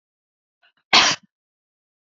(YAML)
cough_length: 2.0 s
cough_amplitude: 32768
cough_signal_mean_std_ratio: 0.25
survey_phase: beta (2021-08-13 to 2022-03-07)
age: 45-64
gender: Female
wearing_mask: 'Yes'
symptom_none: true
smoker_status: Never smoked
respiratory_condition_asthma: false
respiratory_condition_other: false
recruitment_source: REACT
submission_delay: 1 day
covid_test_result: Negative
covid_test_method: RT-qPCR